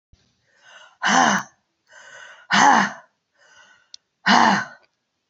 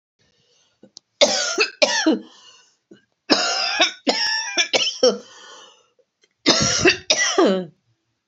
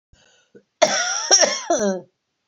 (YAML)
exhalation_length: 5.3 s
exhalation_amplitude: 26862
exhalation_signal_mean_std_ratio: 0.39
three_cough_length: 8.3 s
three_cough_amplitude: 30867
three_cough_signal_mean_std_ratio: 0.51
cough_length: 2.5 s
cough_amplitude: 28356
cough_signal_mean_std_ratio: 0.5
survey_phase: beta (2021-08-13 to 2022-03-07)
age: 45-64
gender: Female
wearing_mask: 'No'
symptom_cough_any: true
symptom_runny_or_blocked_nose: true
symptom_sore_throat: true
symptom_fatigue: true
symptom_headache: true
symptom_other: true
symptom_onset: 4 days
smoker_status: Ex-smoker
respiratory_condition_asthma: false
respiratory_condition_other: false
recruitment_source: Test and Trace
submission_delay: 2 days
covid_test_result: Positive
covid_test_method: RT-qPCR
covid_ct_value: 23.4
covid_ct_gene: ORF1ab gene
covid_ct_mean: 23.4
covid_viral_load: 21000 copies/ml
covid_viral_load_category: Low viral load (10K-1M copies/ml)